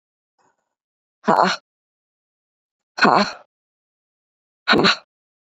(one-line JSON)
{"exhalation_length": "5.5 s", "exhalation_amplitude": 29326, "exhalation_signal_mean_std_ratio": 0.29, "survey_phase": "beta (2021-08-13 to 2022-03-07)", "age": "18-44", "gender": "Female", "wearing_mask": "No", "symptom_cough_any": true, "symptom_shortness_of_breath": true, "symptom_sore_throat": true, "symptom_abdominal_pain": true, "symptom_fever_high_temperature": true, "symptom_headache": true, "symptom_onset": "2 days", "smoker_status": "Never smoked", "respiratory_condition_asthma": true, "respiratory_condition_other": false, "recruitment_source": "Test and Trace", "submission_delay": "1 day", "covid_test_result": "Positive", "covid_test_method": "RT-qPCR", "covid_ct_value": 24.8, "covid_ct_gene": "ORF1ab gene"}